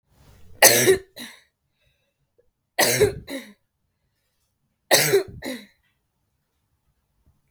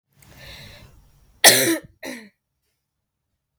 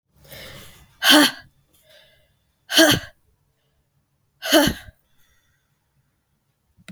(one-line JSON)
{"three_cough_length": "7.5 s", "three_cough_amplitude": 32768, "three_cough_signal_mean_std_ratio": 0.31, "cough_length": "3.6 s", "cough_amplitude": 32768, "cough_signal_mean_std_ratio": 0.25, "exhalation_length": "6.9 s", "exhalation_amplitude": 32768, "exhalation_signal_mean_std_ratio": 0.28, "survey_phase": "beta (2021-08-13 to 2022-03-07)", "age": "18-44", "gender": "Female", "wearing_mask": "No", "symptom_fatigue": true, "symptom_onset": "6 days", "smoker_status": "Never smoked", "respiratory_condition_asthma": false, "respiratory_condition_other": false, "recruitment_source": "REACT", "submission_delay": "3 days", "covid_test_result": "Negative", "covid_test_method": "RT-qPCR", "influenza_a_test_result": "Negative", "influenza_b_test_result": "Negative"}